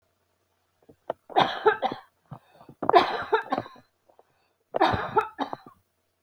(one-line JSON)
{"three_cough_length": "6.2 s", "three_cough_amplitude": 24087, "three_cough_signal_mean_std_ratio": 0.36, "survey_phase": "beta (2021-08-13 to 2022-03-07)", "age": "45-64", "gender": "Female", "wearing_mask": "No", "symptom_none": true, "smoker_status": "Never smoked", "respiratory_condition_asthma": false, "respiratory_condition_other": false, "recruitment_source": "REACT", "submission_delay": "5 days", "covid_test_result": "Negative", "covid_test_method": "RT-qPCR"}